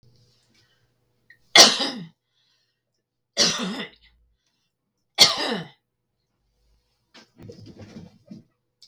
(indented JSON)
{
  "three_cough_length": "8.9 s",
  "three_cough_amplitude": 32768,
  "three_cough_signal_mean_std_ratio": 0.24,
  "survey_phase": "beta (2021-08-13 to 2022-03-07)",
  "age": "45-64",
  "gender": "Female",
  "wearing_mask": "No",
  "symptom_none": true,
  "smoker_status": "Ex-smoker",
  "respiratory_condition_asthma": false,
  "respiratory_condition_other": false,
  "recruitment_source": "REACT",
  "submission_delay": "1 day",
  "covid_test_result": "Negative",
  "covid_test_method": "RT-qPCR"
}